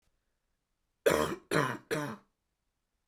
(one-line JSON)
{"three_cough_length": "3.1 s", "three_cough_amplitude": 7167, "three_cough_signal_mean_std_ratio": 0.36, "survey_phase": "beta (2021-08-13 to 2022-03-07)", "age": "18-44", "gender": "Female", "wearing_mask": "No", "symptom_cough_any": true, "symptom_shortness_of_breath": true, "symptom_diarrhoea": true, "symptom_fatigue": true, "symptom_onset": "4 days", "smoker_status": "Never smoked", "respiratory_condition_asthma": false, "respiratory_condition_other": false, "recruitment_source": "Test and Trace", "submission_delay": "1 day", "covid_test_result": "Positive", "covid_test_method": "RT-qPCR", "covid_ct_value": 29.0, "covid_ct_gene": "N gene"}